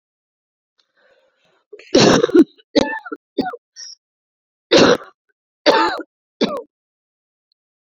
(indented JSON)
{
  "cough_length": "7.9 s",
  "cough_amplitude": 31013,
  "cough_signal_mean_std_ratio": 0.33,
  "survey_phase": "beta (2021-08-13 to 2022-03-07)",
  "age": "18-44",
  "gender": "Female",
  "wearing_mask": "No",
  "symptom_cough_any": true,
  "symptom_runny_or_blocked_nose": true,
  "symptom_fatigue": true,
  "symptom_headache": true,
  "symptom_change_to_sense_of_smell_or_taste": true,
  "symptom_loss_of_taste": true,
  "symptom_onset": "4 days",
  "smoker_status": "Never smoked",
  "respiratory_condition_asthma": true,
  "respiratory_condition_other": false,
  "recruitment_source": "Test and Trace",
  "submission_delay": "2 days",
  "covid_test_result": "Positive",
  "covid_test_method": "LAMP"
}